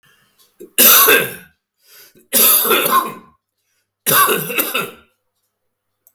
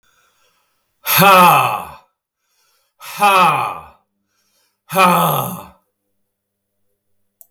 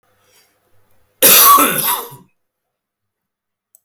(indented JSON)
{
  "three_cough_length": "6.1 s",
  "three_cough_amplitude": 32768,
  "three_cough_signal_mean_std_ratio": 0.47,
  "exhalation_length": "7.5 s",
  "exhalation_amplitude": 32768,
  "exhalation_signal_mean_std_ratio": 0.41,
  "cough_length": "3.8 s",
  "cough_amplitude": 32768,
  "cough_signal_mean_std_ratio": 0.37,
  "survey_phase": "beta (2021-08-13 to 2022-03-07)",
  "age": "65+",
  "gender": "Male",
  "wearing_mask": "No",
  "symptom_none": true,
  "symptom_onset": "4 days",
  "smoker_status": "Ex-smoker",
  "respiratory_condition_asthma": false,
  "respiratory_condition_other": false,
  "recruitment_source": "Test and Trace",
  "submission_delay": "1 day",
  "covid_test_result": "Positive",
  "covid_test_method": "RT-qPCR",
  "covid_ct_value": 19.8,
  "covid_ct_gene": "ORF1ab gene",
  "covid_ct_mean": 20.2,
  "covid_viral_load": "230000 copies/ml",
  "covid_viral_load_category": "Low viral load (10K-1M copies/ml)"
}